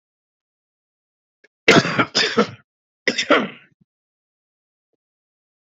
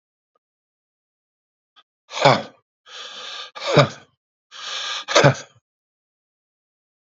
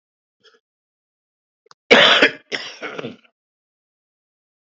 {"cough_length": "5.6 s", "cough_amplitude": 29277, "cough_signal_mean_std_ratio": 0.29, "exhalation_length": "7.2 s", "exhalation_amplitude": 32768, "exhalation_signal_mean_std_ratio": 0.28, "three_cough_length": "4.7 s", "three_cough_amplitude": 32767, "three_cough_signal_mean_std_ratio": 0.26, "survey_phase": "beta (2021-08-13 to 2022-03-07)", "age": "45-64", "gender": "Male", "wearing_mask": "No", "symptom_cough_any": true, "symptom_runny_or_blocked_nose": true, "symptom_fatigue": true, "symptom_headache": true, "symptom_onset": "5 days", "smoker_status": "Ex-smoker", "respiratory_condition_asthma": false, "respiratory_condition_other": false, "recruitment_source": "Test and Trace", "submission_delay": "1 day", "covid_test_result": "Positive", "covid_test_method": "RT-qPCR", "covid_ct_value": 25.5, "covid_ct_gene": "ORF1ab gene", "covid_ct_mean": 25.7, "covid_viral_load": "3800 copies/ml", "covid_viral_load_category": "Minimal viral load (< 10K copies/ml)"}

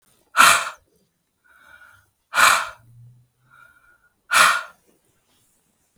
{"exhalation_length": "6.0 s", "exhalation_amplitude": 32768, "exhalation_signal_mean_std_ratio": 0.31, "survey_phase": "beta (2021-08-13 to 2022-03-07)", "age": "45-64", "gender": "Female", "wearing_mask": "No", "symptom_fatigue": true, "smoker_status": "Ex-smoker", "respiratory_condition_asthma": false, "respiratory_condition_other": false, "recruitment_source": "REACT", "submission_delay": "2 days", "covid_test_result": "Negative", "covid_test_method": "RT-qPCR", "influenza_a_test_result": "Negative", "influenza_b_test_result": "Negative"}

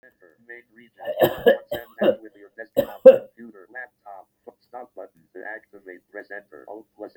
{"cough_length": "7.2 s", "cough_amplitude": 32768, "cough_signal_mean_std_ratio": 0.25, "survey_phase": "beta (2021-08-13 to 2022-03-07)", "age": "65+", "gender": "Male", "wearing_mask": "No", "symptom_runny_or_blocked_nose": true, "symptom_shortness_of_breath": true, "smoker_status": "Ex-smoker", "respiratory_condition_asthma": false, "respiratory_condition_other": false, "recruitment_source": "REACT", "submission_delay": "1 day", "covid_test_result": "Negative", "covid_test_method": "RT-qPCR", "influenza_a_test_result": "Negative", "influenza_b_test_result": "Negative"}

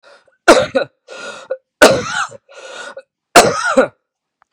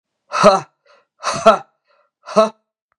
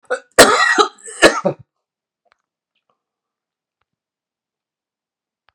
{"three_cough_length": "4.5 s", "three_cough_amplitude": 32768, "three_cough_signal_mean_std_ratio": 0.4, "exhalation_length": "3.0 s", "exhalation_amplitude": 32768, "exhalation_signal_mean_std_ratio": 0.34, "cough_length": "5.5 s", "cough_amplitude": 32768, "cough_signal_mean_std_ratio": 0.27, "survey_phase": "beta (2021-08-13 to 2022-03-07)", "age": "45-64", "gender": "Male", "wearing_mask": "No", "symptom_cough_any": true, "symptom_runny_or_blocked_nose": true, "symptom_sore_throat": true, "symptom_fatigue": true, "symptom_headache": true, "symptom_onset": "2 days", "smoker_status": "Ex-smoker", "respiratory_condition_asthma": false, "respiratory_condition_other": false, "recruitment_source": "Test and Trace", "submission_delay": "2 days", "covid_test_result": "Positive", "covid_test_method": "RT-qPCR", "covid_ct_value": 29.4, "covid_ct_gene": "N gene"}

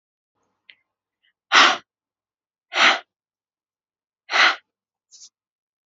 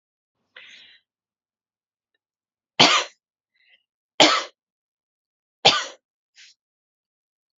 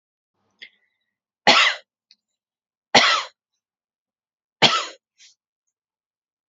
{"exhalation_length": "5.9 s", "exhalation_amplitude": 28329, "exhalation_signal_mean_std_ratio": 0.26, "three_cough_length": "7.6 s", "three_cough_amplitude": 32767, "three_cough_signal_mean_std_ratio": 0.22, "cough_length": "6.5 s", "cough_amplitude": 32767, "cough_signal_mean_std_ratio": 0.26, "survey_phase": "alpha (2021-03-01 to 2021-08-12)", "age": "18-44", "gender": "Female", "wearing_mask": "No", "symptom_none": true, "smoker_status": "Never smoked", "respiratory_condition_asthma": false, "respiratory_condition_other": false, "recruitment_source": "REACT", "submission_delay": "2 days", "covid_test_result": "Negative", "covid_test_method": "RT-qPCR"}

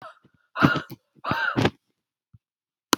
{"exhalation_length": "3.0 s", "exhalation_amplitude": 32099, "exhalation_signal_mean_std_ratio": 0.35, "survey_phase": "beta (2021-08-13 to 2022-03-07)", "age": "45-64", "gender": "Female", "wearing_mask": "No", "symptom_runny_or_blocked_nose": true, "symptom_change_to_sense_of_smell_or_taste": true, "symptom_loss_of_taste": true, "smoker_status": "Never smoked", "respiratory_condition_asthma": false, "respiratory_condition_other": false, "recruitment_source": "Test and Trace", "submission_delay": "2 days", "covid_test_result": "Positive", "covid_test_method": "RT-qPCR"}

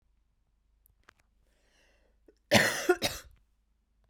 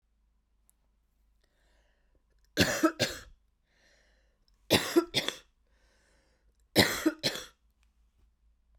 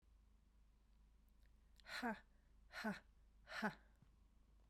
{"cough_length": "4.1 s", "cough_amplitude": 17961, "cough_signal_mean_std_ratio": 0.26, "three_cough_length": "8.8 s", "three_cough_amplitude": 13586, "three_cough_signal_mean_std_ratio": 0.29, "exhalation_length": "4.7 s", "exhalation_amplitude": 1086, "exhalation_signal_mean_std_ratio": 0.42, "survey_phase": "beta (2021-08-13 to 2022-03-07)", "age": "45-64", "gender": "Female", "wearing_mask": "No", "symptom_cough_any": true, "symptom_runny_or_blocked_nose": true, "symptom_other": true, "symptom_onset": "6 days", "smoker_status": "Ex-smoker", "respiratory_condition_asthma": false, "respiratory_condition_other": false, "recruitment_source": "Test and Trace", "submission_delay": "1 day", "covid_test_result": "Positive", "covid_test_method": "RT-qPCR", "covid_ct_value": 25.8, "covid_ct_gene": "ORF1ab gene"}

